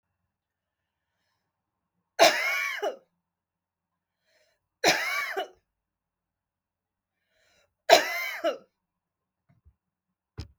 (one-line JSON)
{"three_cough_length": "10.6 s", "three_cough_amplitude": 30221, "three_cough_signal_mean_std_ratio": 0.27, "survey_phase": "beta (2021-08-13 to 2022-03-07)", "age": "45-64", "gender": "Female", "wearing_mask": "No", "symptom_none": true, "symptom_onset": "6 days", "smoker_status": "Never smoked", "respiratory_condition_asthma": false, "respiratory_condition_other": false, "recruitment_source": "REACT", "submission_delay": "1 day", "covid_test_result": "Negative", "covid_test_method": "RT-qPCR", "influenza_a_test_result": "Negative", "influenza_b_test_result": "Negative"}